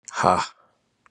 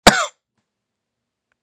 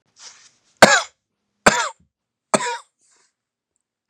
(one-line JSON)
{"exhalation_length": "1.1 s", "exhalation_amplitude": 26870, "exhalation_signal_mean_std_ratio": 0.37, "cough_length": "1.6 s", "cough_amplitude": 32768, "cough_signal_mean_std_ratio": 0.21, "three_cough_length": "4.1 s", "three_cough_amplitude": 32768, "three_cough_signal_mean_std_ratio": 0.25, "survey_phase": "beta (2021-08-13 to 2022-03-07)", "age": "45-64", "gender": "Male", "wearing_mask": "No", "symptom_cough_any": true, "symptom_runny_or_blocked_nose": true, "symptom_sore_throat": true, "symptom_fatigue": true, "symptom_headache": true, "symptom_other": true, "smoker_status": "Never smoked", "respiratory_condition_asthma": false, "respiratory_condition_other": false, "recruitment_source": "Test and Trace", "submission_delay": "2 days", "covid_test_result": "Positive", "covid_test_method": "RT-qPCR", "covid_ct_value": 28.9, "covid_ct_gene": "ORF1ab gene"}